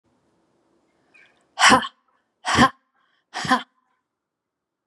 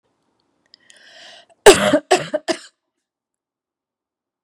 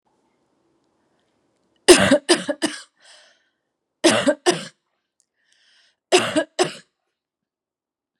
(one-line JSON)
{"exhalation_length": "4.9 s", "exhalation_amplitude": 29370, "exhalation_signal_mean_std_ratio": 0.27, "cough_length": "4.4 s", "cough_amplitude": 32768, "cough_signal_mean_std_ratio": 0.24, "three_cough_length": "8.2 s", "three_cough_amplitude": 32768, "three_cough_signal_mean_std_ratio": 0.29, "survey_phase": "beta (2021-08-13 to 2022-03-07)", "age": "45-64", "gender": "Female", "wearing_mask": "No", "symptom_cough_any": true, "symptom_runny_or_blocked_nose": true, "symptom_fatigue": true, "symptom_onset": "8 days", "smoker_status": "Ex-smoker", "respiratory_condition_asthma": false, "respiratory_condition_other": false, "recruitment_source": "Test and Trace", "submission_delay": "2 days", "covid_test_result": "Positive", "covid_test_method": "ePCR"}